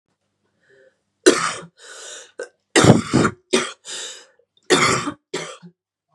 {"three_cough_length": "6.1 s", "three_cough_amplitude": 32768, "three_cough_signal_mean_std_ratio": 0.37, "survey_phase": "beta (2021-08-13 to 2022-03-07)", "age": "18-44", "gender": "Female", "wearing_mask": "No", "symptom_cough_any": true, "symptom_new_continuous_cough": true, "symptom_runny_or_blocked_nose": true, "symptom_shortness_of_breath": true, "symptom_sore_throat": true, "symptom_fatigue": true, "symptom_change_to_sense_of_smell_or_taste": true, "symptom_loss_of_taste": true, "symptom_other": true, "symptom_onset": "4 days", "smoker_status": "Ex-smoker", "respiratory_condition_asthma": false, "respiratory_condition_other": false, "recruitment_source": "Test and Trace", "submission_delay": "2 days", "covid_test_result": "Positive", "covid_test_method": "RT-qPCR", "covid_ct_value": 21.4, "covid_ct_gene": "ORF1ab gene"}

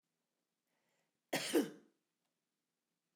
{"cough_length": "3.2 s", "cough_amplitude": 2736, "cough_signal_mean_std_ratio": 0.24, "survey_phase": "alpha (2021-03-01 to 2021-08-12)", "age": "65+", "gender": "Female", "wearing_mask": "No", "symptom_none": true, "smoker_status": "Ex-smoker", "respiratory_condition_asthma": false, "respiratory_condition_other": false, "recruitment_source": "REACT", "submission_delay": "4 days", "covid_test_result": "Negative", "covid_test_method": "RT-qPCR"}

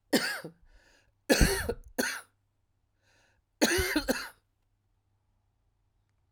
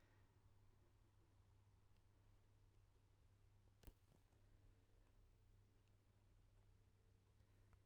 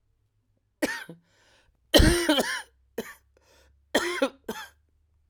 {"three_cough_length": "6.3 s", "three_cough_amplitude": 13339, "three_cough_signal_mean_std_ratio": 0.35, "exhalation_length": "7.9 s", "exhalation_amplitude": 203, "exhalation_signal_mean_std_ratio": 1.07, "cough_length": "5.3 s", "cough_amplitude": 24785, "cough_signal_mean_std_ratio": 0.34, "survey_phase": "alpha (2021-03-01 to 2021-08-12)", "age": "45-64", "gender": "Female", "wearing_mask": "No", "symptom_cough_any": true, "symptom_shortness_of_breath": true, "symptom_fatigue": true, "symptom_headache": true, "symptom_change_to_sense_of_smell_or_taste": true, "symptom_onset": "12 days", "smoker_status": "Ex-smoker", "respiratory_condition_asthma": true, "respiratory_condition_other": false, "recruitment_source": "Test and Trace", "submission_delay": "-1 day", "covid_test_method": "RT-qPCR", "covid_ct_value": 35.7, "covid_ct_gene": "ORF1ab gene", "covid_ct_mean": 35.7, "covid_viral_load": "1.9 copies/ml", "covid_viral_load_category": "Minimal viral load (< 10K copies/ml)"}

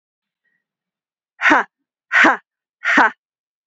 {"exhalation_length": "3.7 s", "exhalation_amplitude": 29221, "exhalation_signal_mean_std_ratio": 0.34, "survey_phase": "beta (2021-08-13 to 2022-03-07)", "age": "45-64", "gender": "Female", "wearing_mask": "Yes", "symptom_sore_throat": true, "smoker_status": "Never smoked", "respiratory_condition_asthma": false, "respiratory_condition_other": false, "recruitment_source": "Test and Trace", "submission_delay": "2 days", "covid_test_result": "Positive", "covid_test_method": "RT-qPCR", "covid_ct_value": 20.5, "covid_ct_gene": "ORF1ab gene", "covid_ct_mean": 20.7, "covid_viral_load": "170000 copies/ml", "covid_viral_load_category": "Low viral load (10K-1M copies/ml)"}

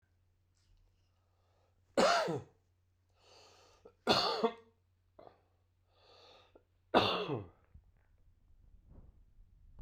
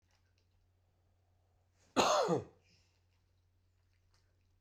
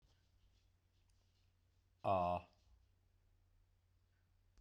{"three_cough_length": "9.8 s", "three_cough_amplitude": 7915, "three_cough_signal_mean_std_ratio": 0.3, "cough_length": "4.6 s", "cough_amplitude": 4960, "cough_signal_mean_std_ratio": 0.27, "exhalation_length": "4.6 s", "exhalation_amplitude": 1613, "exhalation_signal_mean_std_ratio": 0.26, "survey_phase": "beta (2021-08-13 to 2022-03-07)", "age": "45-64", "gender": "Male", "wearing_mask": "No", "symptom_none": true, "smoker_status": "Ex-smoker", "respiratory_condition_asthma": false, "respiratory_condition_other": false, "recruitment_source": "REACT", "submission_delay": "1 day", "covid_test_result": "Negative", "covid_test_method": "RT-qPCR"}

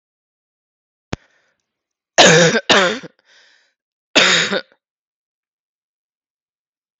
{"three_cough_length": "7.0 s", "three_cough_amplitude": 32768, "three_cough_signal_mean_std_ratio": 0.31, "survey_phase": "beta (2021-08-13 to 2022-03-07)", "age": "18-44", "gender": "Female", "wearing_mask": "No", "symptom_sore_throat": true, "symptom_fatigue": true, "smoker_status": "Never smoked", "respiratory_condition_asthma": false, "respiratory_condition_other": false, "recruitment_source": "Test and Trace", "submission_delay": "2 days", "covid_test_result": "Positive", "covid_test_method": "RT-qPCR", "covid_ct_value": 27.7, "covid_ct_gene": "N gene"}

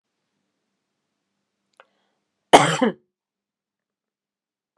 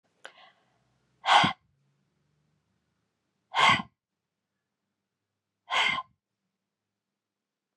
{"cough_length": "4.8 s", "cough_amplitude": 32768, "cough_signal_mean_std_ratio": 0.17, "exhalation_length": "7.8 s", "exhalation_amplitude": 15280, "exhalation_signal_mean_std_ratio": 0.25, "survey_phase": "beta (2021-08-13 to 2022-03-07)", "age": "45-64", "gender": "Female", "wearing_mask": "No", "symptom_sore_throat": true, "smoker_status": "Never smoked", "respiratory_condition_asthma": false, "respiratory_condition_other": false, "recruitment_source": "REACT", "submission_delay": "1 day", "covid_test_result": "Negative", "covid_test_method": "RT-qPCR"}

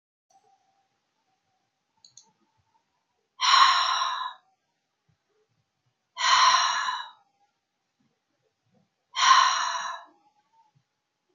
{"exhalation_length": "11.3 s", "exhalation_amplitude": 17869, "exhalation_signal_mean_std_ratio": 0.35, "survey_phase": "beta (2021-08-13 to 2022-03-07)", "age": "65+", "gender": "Female", "wearing_mask": "No", "symptom_none": true, "smoker_status": "Never smoked", "respiratory_condition_asthma": false, "respiratory_condition_other": false, "recruitment_source": "REACT", "submission_delay": "2 days", "covid_test_result": "Negative", "covid_test_method": "RT-qPCR"}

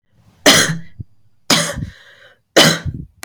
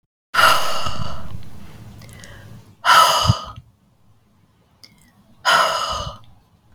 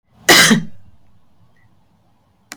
{"three_cough_length": "3.2 s", "three_cough_amplitude": 32768, "three_cough_signal_mean_std_ratio": 0.43, "exhalation_length": "6.7 s", "exhalation_amplitude": 32137, "exhalation_signal_mean_std_ratio": 0.53, "cough_length": "2.6 s", "cough_amplitude": 32768, "cough_signal_mean_std_ratio": 0.34, "survey_phase": "beta (2021-08-13 to 2022-03-07)", "age": "45-64", "gender": "Female", "wearing_mask": "No", "symptom_none": true, "smoker_status": "Never smoked", "respiratory_condition_asthma": false, "respiratory_condition_other": false, "recruitment_source": "REACT", "submission_delay": "2 days", "covid_test_result": "Negative", "covid_test_method": "RT-qPCR", "influenza_a_test_result": "Negative", "influenza_b_test_result": "Negative"}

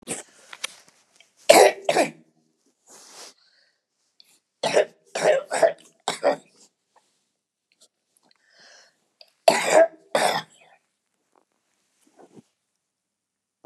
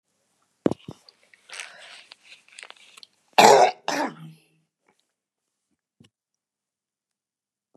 {"three_cough_length": "13.7 s", "three_cough_amplitude": 32768, "three_cough_signal_mean_std_ratio": 0.28, "cough_length": "7.8 s", "cough_amplitude": 32680, "cough_signal_mean_std_ratio": 0.21, "survey_phase": "beta (2021-08-13 to 2022-03-07)", "age": "65+", "gender": "Female", "wearing_mask": "No", "symptom_none": true, "smoker_status": "Never smoked", "respiratory_condition_asthma": false, "respiratory_condition_other": false, "recruitment_source": "REACT", "submission_delay": "2 days", "covid_test_result": "Negative", "covid_test_method": "RT-qPCR", "influenza_a_test_result": "Negative", "influenza_b_test_result": "Negative"}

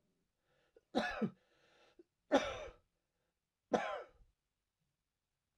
{"three_cough_length": "5.6 s", "three_cough_amplitude": 4587, "three_cough_signal_mean_std_ratio": 0.29, "survey_phase": "alpha (2021-03-01 to 2021-08-12)", "age": "45-64", "gender": "Male", "wearing_mask": "No", "symptom_cough_any": true, "symptom_fatigue": true, "symptom_headache": true, "symptom_change_to_sense_of_smell_or_taste": true, "symptom_loss_of_taste": true, "symptom_onset": "3 days", "smoker_status": "Never smoked", "respiratory_condition_asthma": false, "respiratory_condition_other": false, "recruitment_source": "Test and Trace", "submission_delay": "2 days", "covid_test_result": "Positive", "covid_test_method": "RT-qPCR", "covid_ct_value": 16.7, "covid_ct_gene": "ORF1ab gene"}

